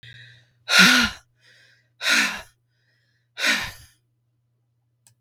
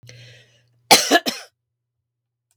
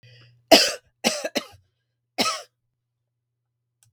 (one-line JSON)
{"exhalation_length": "5.2 s", "exhalation_amplitude": 32766, "exhalation_signal_mean_std_ratio": 0.34, "cough_length": "2.6 s", "cough_amplitude": 32768, "cough_signal_mean_std_ratio": 0.26, "three_cough_length": "3.9 s", "three_cough_amplitude": 32768, "three_cough_signal_mean_std_ratio": 0.26, "survey_phase": "beta (2021-08-13 to 2022-03-07)", "age": "45-64", "gender": "Female", "wearing_mask": "No", "symptom_cough_any": true, "symptom_sore_throat": true, "symptom_fatigue": true, "smoker_status": "Never smoked", "respiratory_condition_asthma": false, "respiratory_condition_other": false, "recruitment_source": "REACT", "submission_delay": "3 days", "covid_test_result": "Negative", "covid_test_method": "RT-qPCR", "influenza_a_test_result": "Negative", "influenza_b_test_result": "Negative"}